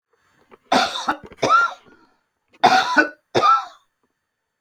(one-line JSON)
{"cough_length": "4.6 s", "cough_amplitude": 27744, "cough_signal_mean_std_ratio": 0.44, "survey_phase": "beta (2021-08-13 to 2022-03-07)", "age": "65+", "gender": "Female", "wearing_mask": "No", "symptom_cough_any": true, "symptom_runny_or_blocked_nose": true, "symptom_onset": "5 days", "smoker_status": "Ex-smoker", "respiratory_condition_asthma": false, "respiratory_condition_other": false, "recruitment_source": "REACT", "submission_delay": "7 days", "covid_test_result": "Negative", "covid_test_method": "RT-qPCR"}